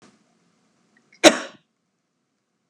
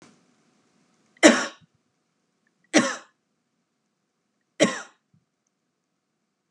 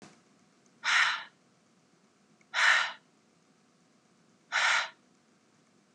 cough_length: 2.7 s
cough_amplitude: 32768
cough_signal_mean_std_ratio: 0.15
three_cough_length: 6.5 s
three_cough_amplitude: 31828
three_cough_signal_mean_std_ratio: 0.2
exhalation_length: 5.9 s
exhalation_amplitude: 10289
exhalation_signal_mean_std_ratio: 0.35
survey_phase: beta (2021-08-13 to 2022-03-07)
age: 18-44
gender: Female
wearing_mask: 'No'
symptom_none: true
smoker_status: Ex-smoker
respiratory_condition_asthma: false
respiratory_condition_other: false
recruitment_source: REACT
submission_delay: 1 day
covid_test_result: Negative
covid_test_method: RT-qPCR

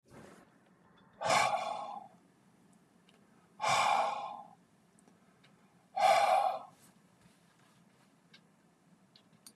exhalation_length: 9.6 s
exhalation_amplitude: 5208
exhalation_signal_mean_std_ratio: 0.39
survey_phase: beta (2021-08-13 to 2022-03-07)
age: 65+
gender: Male
wearing_mask: 'No'
symptom_none: true
smoker_status: Never smoked
respiratory_condition_asthma: false
respiratory_condition_other: false
recruitment_source: REACT
submission_delay: 2 days
covid_test_result: Negative
covid_test_method: RT-qPCR
influenza_a_test_result: Negative
influenza_b_test_result: Negative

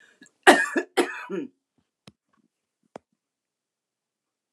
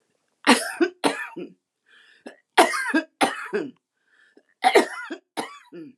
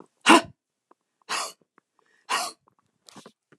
cough_length: 4.5 s
cough_amplitude: 29203
cough_signal_mean_std_ratio: 0.23
three_cough_length: 6.0 s
three_cough_amplitude: 28868
three_cough_signal_mean_std_ratio: 0.38
exhalation_length: 3.6 s
exhalation_amplitude: 29203
exhalation_signal_mean_std_ratio: 0.23
survey_phase: beta (2021-08-13 to 2022-03-07)
age: 65+
gender: Female
wearing_mask: 'No'
symptom_none: true
smoker_status: Never smoked
respiratory_condition_asthma: false
respiratory_condition_other: false
recruitment_source: REACT
submission_delay: 2 days
covid_test_result: Negative
covid_test_method: RT-qPCR
influenza_a_test_result: Negative
influenza_b_test_result: Negative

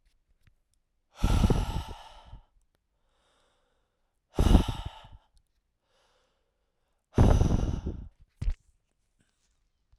exhalation_length: 10.0 s
exhalation_amplitude: 17202
exhalation_signal_mean_std_ratio: 0.32
survey_phase: alpha (2021-03-01 to 2021-08-12)
age: 18-44
gender: Male
wearing_mask: 'No'
symptom_cough_any: true
symptom_shortness_of_breath: true
symptom_fatigue: true
symptom_onset: 3 days
smoker_status: Prefer not to say
respiratory_condition_asthma: false
respiratory_condition_other: false
recruitment_source: Test and Trace
submission_delay: 2 days
covid_test_result: Positive
covid_test_method: RT-qPCR
covid_ct_value: 32.2
covid_ct_gene: N gene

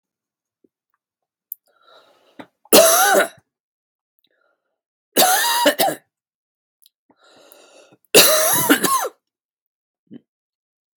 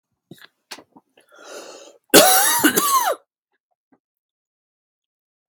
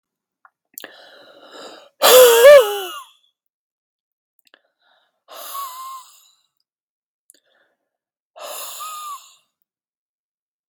three_cough_length: 11.0 s
three_cough_amplitude: 32768
three_cough_signal_mean_std_ratio: 0.35
cough_length: 5.5 s
cough_amplitude: 32768
cough_signal_mean_std_ratio: 0.34
exhalation_length: 10.7 s
exhalation_amplitude: 32768
exhalation_signal_mean_std_ratio: 0.25
survey_phase: beta (2021-08-13 to 2022-03-07)
age: 18-44
gender: Male
wearing_mask: 'No'
symptom_none: true
smoker_status: Never smoked
respiratory_condition_asthma: false
respiratory_condition_other: false
recruitment_source: REACT
submission_delay: 1 day
covid_test_result: Negative
covid_test_method: RT-qPCR
influenza_a_test_result: Negative
influenza_b_test_result: Negative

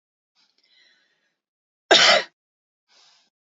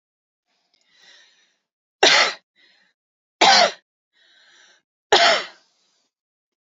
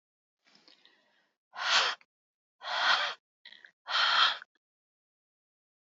cough_length: 3.5 s
cough_amplitude: 28469
cough_signal_mean_std_ratio: 0.24
three_cough_length: 6.7 s
three_cough_amplitude: 29539
three_cough_signal_mean_std_ratio: 0.29
exhalation_length: 5.8 s
exhalation_amplitude: 11541
exhalation_signal_mean_std_ratio: 0.38
survey_phase: beta (2021-08-13 to 2022-03-07)
age: 18-44
gender: Female
wearing_mask: 'No'
symptom_none: true
smoker_status: Ex-smoker
respiratory_condition_asthma: false
respiratory_condition_other: false
recruitment_source: REACT
submission_delay: 4 days
covid_test_result: Negative
covid_test_method: RT-qPCR
influenza_a_test_result: Negative
influenza_b_test_result: Negative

